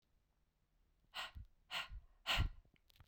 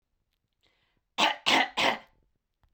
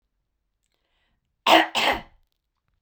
exhalation_length: 3.1 s
exhalation_amplitude: 1658
exhalation_signal_mean_std_ratio: 0.37
three_cough_length: 2.7 s
three_cough_amplitude: 12902
three_cough_signal_mean_std_ratio: 0.36
cough_length: 2.8 s
cough_amplitude: 28422
cough_signal_mean_std_ratio: 0.29
survey_phase: beta (2021-08-13 to 2022-03-07)
age: 45-64
gender: Female
wearing_mask: 'No'
symptom_cough_any: true
symptom_runny_or_blocked_nose: true
smoker_status: Never smoked
respiratory_condition_asthma: false
respiratory_condition_other: false
recruitment_source: REACT
submission_delay: 1 day
covid_test_result: Negative
covid_test_method: RT-qPCR
influenza_a_test_result: Unknown/Void
influenza_b_test_result: Unknown/Void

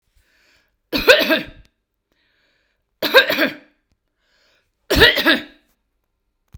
three_cough_length: 6.6 s
three_cough_amplitude: 32768
three_cough_signal_mean_std_ratio: 0.33
survey_phase: beta (2021-08-13 to 2022-03-07)
age: 45-64
gender: Female
wearing_mask: 'No'
symptom_none: true
smoker_status: Never smoked
respiratory_condition_asthma: false
respiratory_condition_other: false
recruitment_source: Test and Trace
submission_delay: 1 day
covid_test_result: Negative
covid_test_method: RT-qPCR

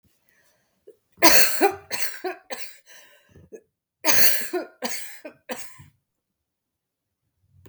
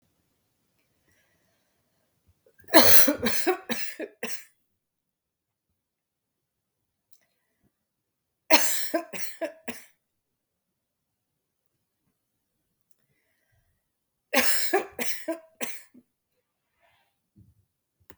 cough_length: 7.7 s
cough_amplitude: 32768
cough_signal_mean_std_ratio: 0.33
three_cough_length: 18.2 s
three_cough_amplitude: 32768
three_cough_signal_mean_std_ratio: 0.25
survey_phase: beta (2021-08-13 to 2022-03-07)
age: 45-64
gender: Female
wearing_mask: 'No'
symptom_cough_any: true
symptom_runny_or_blocked_nose: true
symptom_onset: 9 days
smoker_status: Ex-smoker
respiratory_condition_asthma: true
respiratory_condition_other: false
recruitment_source: REACT
submission_delay: 2 days
covid_test_result: Negative
covid_test_method: RT-qPCR
influenza_a_test_result: Unknown/Void
influenza_b_test_result: Unknown/Void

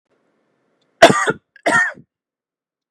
three_cough_length: 2.9 s
three_cough_amplitude: 32768
three_cough_signal_mean_std_ratio: 0.3
survey_phase: beta (2021-08-13 to 2022-03-07)
age: 65+
gender: Female
wearing_mask: 'No'
symptom_none: true
symptom_onset: 9 days
smoker_status: Ex-smoker
respiratory_condition_asthma: false
respiratory_condition_other: false
recruitment_source: REACT
submission_delay: 2 days
covid_test_result: Negative
covid_test_method: RT-qPCR
influenza_a_test_result: Unknown/Void
influenza_b_test_result: Unknown/Void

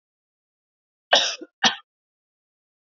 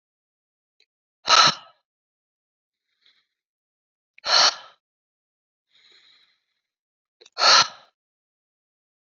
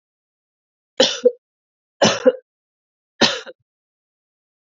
cough_length: 2.9 s
cough_amplitude: 27250
cough_signal_mean_std_ratio: 0.24
exhalation_length: 9.1 s
exhalation_amplitude: 28215
exhalation_signal_mean_std_ratio: 0.23
three_cough_length: 4.6 s
three_cough_amplitude: 30649
three_cough_signal_mean_std_ratio: 0.27
survey_phase: beta (2021-08-13 to 2022-03-07)
age: 18-44
gender: Female
wearing_mask: 'No'
symptom_runny_or_blocked_nose: true
symptom_onset: 5 days
smoker_status: Never smoked
respiratory_condition_asthma: false
respiratory_condition_other: false
recruitment_source: REACT
submission_delay: 1 day
covid_test_result: Negative
covid_test_method: RT-qPCR
influenza_a_test_result: Negative
influenza_b_test_result: Negative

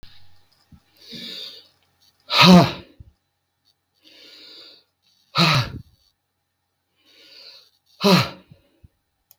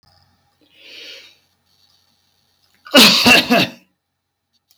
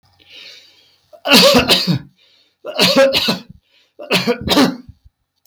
exhalation_length: 9.4 s
exhalation_amplitude: 32768
exhalation_signal_mean_std_ratio: 0.27
cough_length: 4.8 s
cough_amplitude: 32768
cough_signal_mean_std_ratio: 0.32
three_cough_length: 5.5 s
three_cough_amplitude: 32768
three_cough_signal_mean_std_ratio: 0.51
survey_phase: beta (2021-08-13 to 2022-03-07)
age: 65+
gender: Male
wearing_mask: 'No'
symptom_cough_any: true
symptom_runny_or_blocked_nose: true
symptom_sore_throat: true
smoker_status: Ex-smoker
respiratory_condition_asthma: false
respiratory_condition_other: false
recruitment_source: REACT
submission_delay: 1 day
covid_test_result: Negative
covid_test_method: RT-qPCR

